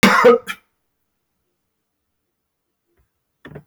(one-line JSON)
{"cough_length": "3.7 s", "cough_amplitude": 31181, "cough_signal_mean_std_ratio": 0.26, "survey_phase": "beta (2021-08-13 to 2022-03-07)", "age": "65+", "gender": "Male", "wearing_mask": "No", "symptom_sore_throat": true, "smoker_status": "Never smoked", "respiratory_condition_asthma": false, "respiratory_condition_other": false, "recruitment_source": "REACT", "submission_delay": "2 days", "covid_test_result": "Negative", "covid_test_method": "RT-qPCR", "influenza_a_test_result": "Unknown/Void", "influenza_b_test_result": "Unknown/Void"}